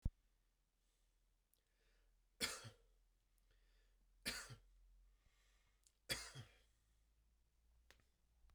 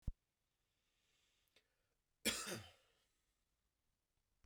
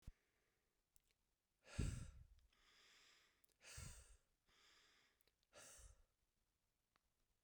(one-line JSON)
{"three_cough_length": "8.5 s", "three_cough_amplitude": 1604, "three_cough_signal_mean_std_ratio": 0.27, "cough_length": "4.5 s", "cough_amplitude": 1962, "cough_signal_mean_std_ratio": 0.23, "exhalation_length": "7.4 s", "exhalation_amplitude": 890, "exhalation_signal_mean_std_ratio": 0.29, "survey_phase": "beta (2021-08-13 to 2022-03-07)", "age": "18-44", "gender": "Male", "wearing_mask": "No", "symptom_shortness_of_breath": true, "symptom_sore_throat": true, "symptom_fatigue": true, "symptom_headache": true, "symptom_onset": "3 days", "smoker_status": "Never smoked", "respiratory_condition_asthma": false, "respiratory_condition_other": true, "recruitment_source": "Test and Trace", "submission_delay": "2 days", "covid_test_result": "Positive", "covid_test_method": "RT-qPCR", "covid_ct_value": 23.4, "covid_ct_gene": "ORF1ab gene"}